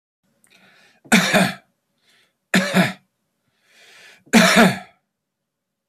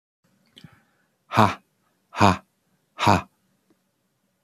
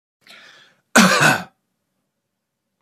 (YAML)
three_cough_length: 5.9 s
three_cough_amplitude: 30490
three_cough_signal_mean_std_ratio: 0.35
exhalation_length: 4.4 s
exhalation_amplitude: 27926
exhalation_signal_mean_std_ratio: 0.26
cough_length: 2.8 s
cough_amplitude: 29787
cough_signal_mean_std_ratio: 0.32
survey_phase: beta (2021-08-13 to 2022-03-07)
age: 45-64
gender: Male
wearing_mask: 'No'
symptom_none: true
symptom_onset: 5 days
smoker_status: Current smoker (11 or more cigarettes per day)
respiratory_condition_asthma: false
respiratory_condition_other: false
recruitment_source: REACT
submission_delay: 1 day
covid_test_result: Negative
covid_test_method: RT-qPCR